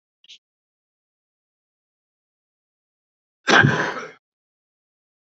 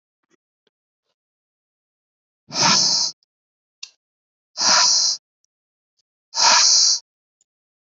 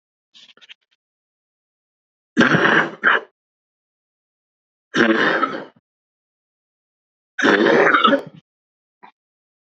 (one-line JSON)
{"cough_length": "5.4 s", "cough_amplitude": 29169, "cough_signal_mean_std_ratio": 0.22, "exhalation_length": "7.9 s", "exhalation_amplitude": 28023, "exhalation_signal_mean_std_ratio": 0.39, "three_cough_length": "9.6 s", "three_cough_amplitude": 28255, "three_cough_signal_mean_std_ratio": 0.38, "survey_phase": "beta (2021-08-13 to 2022-03-07)", "age": "18-44", "gender": "Male", "wearing_mask": "No", "symptom_cough_any": true, "symptom_onset": "12 days", "smoker_status": "Prefer not to say", "respiratory_condition_asthma": false, "respiratory_condition_other": false, "recruitment_source": "REACT", "submission_delay": "1 day", "covid_test_result": "Negative", "covid_test_method": "RT-qPCR", "covid_ct_value": 38.0, "covid_ct_gene": "N gene"}